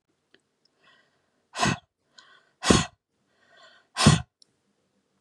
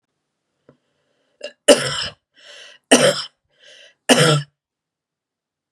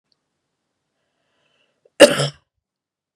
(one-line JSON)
{"exhalation_length": "5.2 s", "exhalation_amplitude": 30342, "exhalation_signal_mean_std_ratio": 0.25, "three_cough_length": "5.7 s", "three_cough_amplitude": 32768, "three_cough_signal_mean_std_ratio": 0.3, "cough_length": "3.2 s", "cough_amplitude": 32768, "cough_signal_mean_std_ratio": 0.18, "survey_phase": "beta (2021-08-13 to 2022-03-07)", "age": "45-64", "gender": "Female", "wearing_mask": "No", "symptom_none": true, "smoker_status": "Never smoked", "respiratory_condition_asthma": false, "respiratory_condition_other": false, "recruitment_source": "REACT", "submission_delay": "1 day", "covid_test_result": "Negative", "covid_test_method": "RT-qPCR", "influenza_a_test_result": "Negative", "influenza_b_test_result": "Negative"}